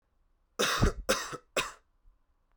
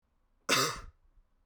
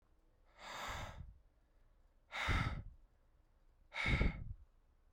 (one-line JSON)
{"three_cough_length": "2.6 s", "three_cough_amplitude": 7679, "three_cough_signal_mean_std_ratio": 0.41, "cough_length": "1.5 s", "cough_amplitude": 7793, "cough_signal_mean_std_ratio": 0.37, "exhalation_length": "5.1 s", "exhalation_amplitude": 3270, "exhalation_signal_mean_std_ratio": 0.44, "survey_phase": "beta (2021-08-13 to 2022-03-07)", "age": "18-44", "gender": "Male", "wearing_mask": "No", "symptom_cough_any": true, "symptom_runny_or_blocked_nose": true, "symptom_shortness_of_breath": true, "symptom_change_to_sense_of_smell_or_taste": true, "symptom_loss_of_taste": true, "symptom_onset": "3 days", "smoker_status": "Current smoker (e-cigarettes or vapes only)", "respiratory_condition_asthma": false, "respiratory_condition_other": false, "recruitment_source": "Test and Trace", "submission_delay": "2 days", "covid_test_result": "Positive", "covid_test_method": "RT-qPCR"}